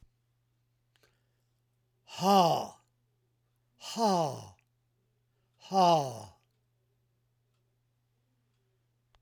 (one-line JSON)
{"exhalation_length": "9.2 s", "exhalation_amplitude": 9705, "exhalation_signal_mean_std_ratio": 0.31, "survey_phase": "alpha (2021-03-01 to 2021-08-12)", "age": "65+", "gender": "Male", "wearing_mask": "No", "symptom_cough_any": true, "smoker_status": "Ex-smoker", "respiratory_condition_asthma": false, "respiratory_condition_other": true, "recruitment_source": "REACT", "submission_delay": "2 days", "covid_test_result": "Negative", "covid_test_method": "RT-qPCR"}